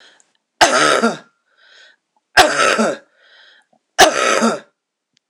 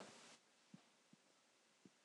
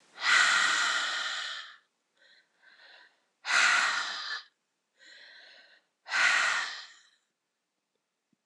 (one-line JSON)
{"three_cough_length": "5.3 s", "three_cough_amplitude": 26028, "three_cough_signal_mean_std_ratio": 0.44, "cough_length": "2.0 s", "cough_amplitude": 241, "cough_signal_mean_std_ratio": 0.65, "exhalation_length": "8.5 s", "exhalation_amplitude": 10009, "exhalation_signal_mean_std_ratio": 0.48, "survey_phase": "beta (2021-08-13 to 2022-03-07)", "age": "45-64", "gender": "Female", "wearing_mask": "No", "symptom_cough_any": true, "symptom_runny_or_blocked_nose": true, "symptom_fatigue": true, "symptom_change_to_sense_of_smell_or_taste": true, "symptom_onset": "3 days", "smoker_status": "Ex-smoker", "respiratory_condition_asthma": false, "respiratory_condition_other": false, "recruitment_source": "Test and Trace", "submission_delay": "2 days", "covid_test_result": "Positive", "covid_test_method": "LAMP"}